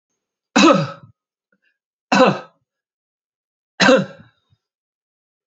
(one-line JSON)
{"three_cough_length": "5.5 s", "three_cough_amplitude": 31404, "three_cough_signal_mean_std_ratio": 0.31, "survey_phase": "alpha (2021-03-01 to 2021-08-12)", "age": "65+", "gender": "Male", "wearing_mask": "No", "symptom_none": true, "smoker_status": "Never smoked", "respiratory_condition_asthma": false, "respiratory_condition_other": false, "recruitment_source": "REACT", "submission_delay": "2 days", "covid_test_result": "Negative", "covid_test_method": "RT-qPCR"}